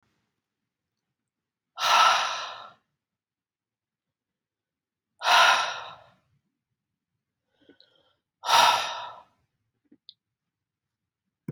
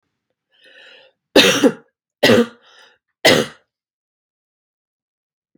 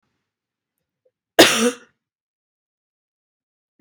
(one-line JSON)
{"exhalation_length": "11.5 s", "exhalation_amplitude": 16178, "exhalation_signal_mean_std_ratio": 0.29, "three_cough_length": "5.6 s", "three_cough_amplitude": 32768, "three_cough_signal_mean_std_ratio": 0.3, "cough_length": "3.8 s", "cough_amplitude": 32768, "cough_signal_mean_std_ratio": 0.2, "survey_phase": "beta (2021-08-13 to 2022-03-07)", "age": "18-44", "gender": "Female", "wearing_mask": "No", "symptom_none": true, "smoker_status": "Never smoked", "respiratory_condition_asthma": false, "respiratory_condition_other": false, "recruitment_source": "REACT", "submission_delay": "1 day", "covid_test_result": "Negative", "covid_test_method": "RT-qPCR"}